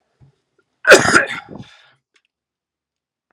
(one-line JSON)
{"cough_length": "3.3 s", "cough_amplitude": 32768, "cough_signal_mean_std_ratio": 0.26, "survey_phase": "alpha (2021-03-01 to 2021-08-12)", "age": "45-64", "gender": "Male", "wearing_mask": "No", "symptom_cough_any": true, "symptom_onset": "2 days", "smoker_status": "Never smoked", "respiratory_condition_asthma": true, "respiratory_condition_other": false, "recruitment_source": "Test and Trace", "submission_delay": "2 days", "covid_test_result": "Positive", "covid_test_method": "RT-qPCR"}